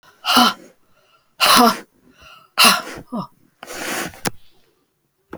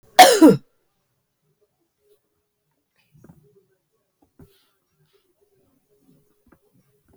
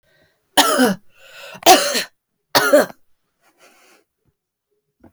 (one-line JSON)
{"exhalation_length": "5.4 s", "exhalation_amplitude": 32768, "exhalation_signal_mean_std_ratio": 0.38, "cough_length": "7.2 s", "cough_amplitude": 32768, "cough_signal_mean_std_ratio": 0.18, "three_cough_length": "5.1 s", "three_cough_amplitude": 32767, "three_cough_signal_mean_std_ratio": 0.35, "survey_phase": "beta (2021-08-13 to 2022-03-07)", "age": "45-64", "gender": "Female", "wearing_mask": "No", "symptom_cough_any": true, "symptom_runny_or_blocked_nose": true, "symptom_sore_throat": true, "symptom_headache": true, "symptom_onset": "2 days", "smoker_status": "Never smoked", "respiratory_condition_asthma": false, "respiratory_condition_other": false, "recruitment_source": "Test and Trace", "submission_delay": "2 days", "covid_test_result": "Positive", "covid_test_method": "ePCR"}